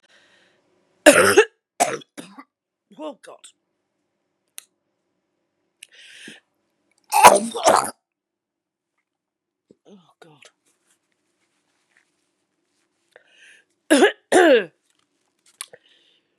{"three_cough_length": "16.4 s", "three_cough_amplitude": 32768, "three_cough_signal_mean_std_ratio": 0.24, "survey_phase": "beta (2021-08-13 to 2022-03-07)", "age": "45-64", "gender": "Female", "wearing_mask": "No", "symptom_cough_any": true, "symptom_runny_or_blocked_nose": true, "symptom_sore_throat": true, "symptom_abdominal_pain": true, "symptom_fatigue": true, "symptom_fever_high_temperature": true, "symptom_headache": true, "symptom_change_to_sense_of_smell_or_taste": true, "symptom_loss_of_taste": true, "symptom_onset": "2 days", "smoker_status": "Current smoker (1 to 10 cigarettes per day)", "respiratory_condition_asthma": false, "respiratory_condition_other": false, "recruitment_source": "Test and Trace", "submission_delay": "2 days", "covid_test_result": "Positive", "covid_test_method": "RT-qPCR", "covid_ct_value": 23.5, "covid_ct_gene": "N gene"}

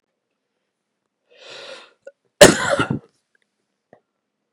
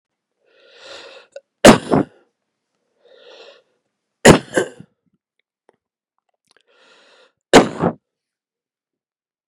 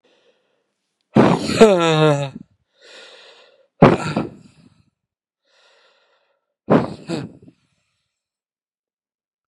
{"cough_length": "4.5 s", "cough_amplitude": 32768, "cough_signal_mean_std_ratio": 0.21, "three_cough_length": "9.5 s", "three_cough_amplitude": 32768, "three_cough_signal_mean_std_ratio": 0.21, "exhalation_length": "9.5 s", "exhalation_amplitude": 32768, "exhalation_signal_mean_std_ratio": 0.31, "survey_phase": "beta (2021-08-13 to 2022-03-07)", "age": "45-64", "gender": "Male", "wearing_mask": "No", "symptom_cough_any": true, "symptom_runny_or_blocked_nose": true, "symptom_sore_throat": true, "symptom_fatigue": true, "symptom_headache": true, "smoker_status": "Ex-smoker", "respiratory_condition_asthma": false, "respiratory_condition_other": false, "recruitment_source": "Test and Trace", "submission_delay": "1 day", "covid_test_result": "Positive", "covid_test_method": "ePCR"}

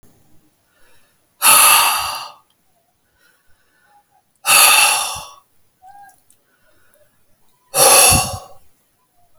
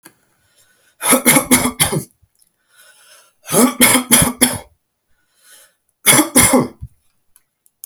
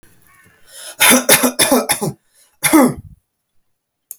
{"exhalation_length": "9.4 s", "exhalation_amplitude": 32768, "exhalation_signal_mean_std_ratio": 0.38, "three_cough_length": "7.9 s", "three_cough_amplitude": 32768, "three_cough_signal_mean_std_ratio": 0.42, "cough_length": "4.2 s", "cough_amplitude": 32768, "cough_signal_mean_std_ratio": 0.43, "survey_phase": "alpha (2021-03-01 to 2021-08-12)", "age": "18-44", "gender": "Male", "wearing_mask": "No", "symptom_none": true, "symptom_onset": "8 days", "smoker_status": "Never smoked", "respiratory_condition_asthma": true, "respiratory_condition_other": false, "recruitment_source": "REACT", "submission_delay": "3 days", "covid_test_result": "Negative", "covid_test_method": "RT-qPCR"}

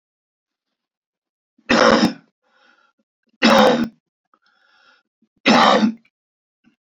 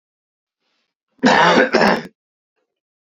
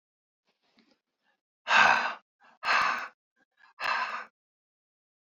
{"three_cough_length": "6.8 s", "three_cough_amplitude": 29863, "three_cough_signal_mean_std_ratio": 0.36, "cough_length": "3.2 s", "cough_amplitude": 30482, "cough_signal_mean_std_ratio": 0.4, "exhalation_length": "5.4 s", "exhalation_amplitude": 14854, "exhalation_signal_mean_std_ratio": 0.35, "survey_phase": "beta (2021-08-13 to 2022-03-07)", "age": "65+", "gender": "Male", "wearing_mask": "No", "symptom_cough_any": true, "symptom_runny_or_blocked_nose": true, "symptom_sore_throat": true, "symptom_fatigue": true, "symptom_headache": true, "symptom_other": true, "smoker_status": "Never smoked", "respiratory_condition_asthma": false, "respiratory_condition_other": false, "recruitment_source": "Test and Trace", "submission_delay": "1 day", "covid_test_result": "Positive", "covid_test_method": "RT-qPCR", "covid_ct_value": 21.0, "covid_ct_gene": "ORF1ab gene", "covid_ct_mean": 22.0, "covid_viral_load": "60000 copies/ml", "covid_viral_load_category": "Low viral load (10K-1M copies/ml)"}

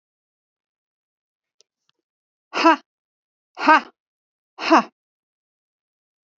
{"exhalation_length": "6.4 s", "exhalation_amplitude": 27494, "exhalation_signal_mean_std_ratio": 0.21, "survey_phase": "beta (2021-08-13 to 2022-03-07)", "age": "45-64", "gender": "Female", "wearing_mask": "No", "symptom_none": true, "smoker_status": "Ex-smoker", "respiratory_condition_asthma": false, "respiratory_condition_other": false, "recruitment_source": "REACT", "submission_delay": "1 day", "covid_test_result": "Negative", "covid_test_method": "RT-qPCR", "influenza_a_test_result": "Negative", "influenza_b_test_result": "Negative"}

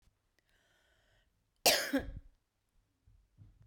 {"cough_length": "3.7 s", "cough_amplitude": 8203, "cough_signal_mean_std_ratio": 0.25, "survey_phase": "beta (2021-08-13 to 2022-03-07)", "age": "45-64", "gender": "Female", "wearing_mask": "No", "symptom_cough_any": true, "symptom_runny_or_blocked_nose": true, "symptom_shortness_of_breath": true, "symptom_sore_throat": true, "symptom_fatigue": true, "symptom_change_to_sense_of_smell_or_taste": true, "symptom_loss_of_taste": true, "symptom_onset": "3 days", "smoker_status": "Never smoked", "respiratory_condition_asthma": false, "respiratory_condition_other": false, "recruitment_source": "Test and Trace", "submission_delay": "2 days", "covid_test_result": "Positive", "covid_test_method": "ePCR"}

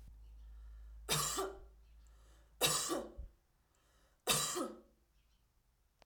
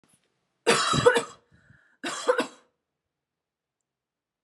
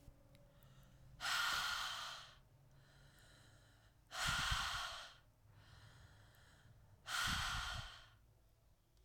{"three_cough_length": "6.1 s", "three_cough_amplitude": 4438, "three_cough_signal_mean_std_ratio": 0.46, "cough_length": "4.4 s", "cough_amplitude": 18771, "cough_signal_mean_std_ratio": 0.33, "exhalation_length": "9.0 s", "exhalation_amplitude": 1653, "exhalation_signal_mean_std_ratio": 0.54, "survey_phase": "alpha (2021-03-01 to 2021-08-12)", "age": "18-44", "gender": "Female", "wearing_mask": "No", "symptom_diarrhoea": true, "smoker_status": "Never smoked", "respiratory_condition_asthma": false, "respiratory_condition_other": false, "recruitment_source": "REACT", "submission_delay": "1 day", "covid_test_result": "Negative", "covid_test_method": "RT-qPCR"}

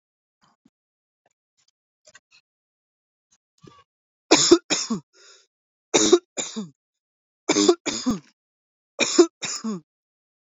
{"three_cough_length": "10.5 s", "three_cough_amplitude": 27619, "three_cough_signal_mean_std_ratio": 0.29, "survey_phase": "beta (2021-08-13 to 2022-03-07)", "age": "18-44", "gender": "Male", "wearing_mask": "No", "symptom_none": true, "smoker_status": "Never smoked", "respiratory_condition_asthma": false, "respiratory_condition_other": false, "recruitment_source": "REACT", "submission_delay": "1 day", "covid_test_result": "Negative", "covid_test_method": "RT-qPCR"}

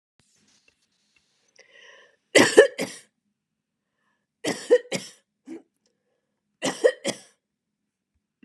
{"three_cough_length": "8.4 s", "three_cough_amplitude": 32599, "three_cough_signal_mean_std_ratio": 0.22, "survey_phase": "beta (2021-08-13 to 2022-03-07)", "age": "45-64", "gender": "Female", "wearing_mask": "No", "symptom_none": true, "smoker_status": "Never smoked", "respiratory_condition_asthma": false, "respiratory_condition_other": false, "recruitment_source": "REACT", "submission_delay": "2 days", "covid_test_result": "Negative", "covid_test_method": "RT-qPCR", "influenza_a_test_result": "Negative", "influenza_b_test_result": "Negative"}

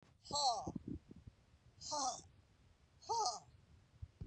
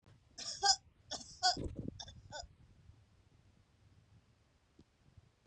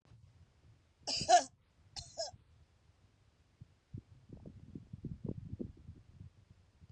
{"exhalation_length": "4.3 s", "exhalation_amplitude": 1919, "exhalation_signal_mean_std_ratio": 0.49, "three_cough_length": "5.5 s", "three_cough_amplitude": 4989, "three_cough_signal_mean_std_ratio": 0.3, "cough_length": "6.9 s", "cough_amplitude": 6391, "cough_signal_mean_std_ratio": 0.27, "survey_phase": "beta (2021-08-13 to 2022-03-07)", "age": "65+", "gender": "Female", "wearing_mask": "No", "symptom_none": true, "smoker_status": "Ex-smoker", "respiratory_condition_asthma": false, "respiratory_condition_other": false, "recruitment_source": "REACT", "submission_delay": "1 day", "covid_test_result": "Negative", "covid_test_method": "RT-qPCR", "influenza_a_test_result": "Negative", "influenza_b_test_result": "Negative"}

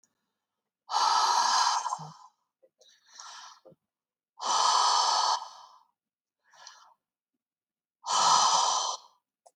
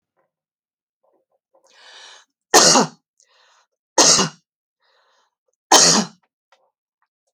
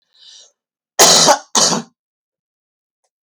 {"exhalation_length": "9.6 s", "exhalation_amplitude": 10665, "exhalation_signal_mean_std_ratio": 0.49, "three_cough_length": "7.3 s", "three_cough_amplitude": 31882, "three_cough_signal_mean_std_ratio": 0.29, "cough_length": "3.2 s", "cough_amplitude": 32768, "cough_signal_mean_std_ratio": 0.36, "survey_phase": "beta (2021-08-13 to 2022-03-07)", "age": "45-64", "gender": "Female", "wearing_mask": "No", "symptom_fatigue": true, "smoker_status": "Never smoked", "respiratory_condition_asthma": true, "respiratory_condition_other": false, "recruitment_source": "REACT", "submission_delay": "2 days", "covid_test_result": "Negative", "covid_test_method": "RT-qPCR"}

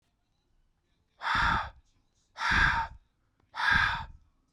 {"exhalation_length": "4.5 s", "exhalation_amplitude": 7651, "exhalation_signal_mean_std_ratio": 0.47, "survey_phase": "beta (2021-08-13 to 2022-03-07)", "age": "18-44", "gender": "Male", "wearing_mask": "No", "symptom_none": true, "smoker_status": "Current smoker (e-cigarettes or vapes only)", "respiratory_condition_asthma": false, "respiratory_condition_other": false, "recruitment_source": "REACT", "submission_delay": "1 day", "covid_test_result": "Negative", "covid_test_method": "RT-qPCR"}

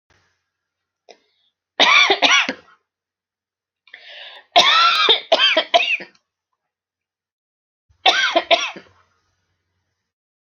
{"three_cough_length": "10.6 s", "three_cough_amplitude": 32553, "three_cough_signal_mean_std_ratio": 0.38, "survey_phase": "alpha (2021-03-01 to 2021-08-12)", "age": "45-64", "gender": "Female", "wearing_mask": "No", "symptom_headache": true, "smoker_status": "Never smoked", "respiratory_condition_asthma": false, "respiratory_condition_other": false, "recruitment_source": "REACT", "submission_delay": "1 day", "covid_test_result": "Negative", "covid_test_method": "RT-qPCR"}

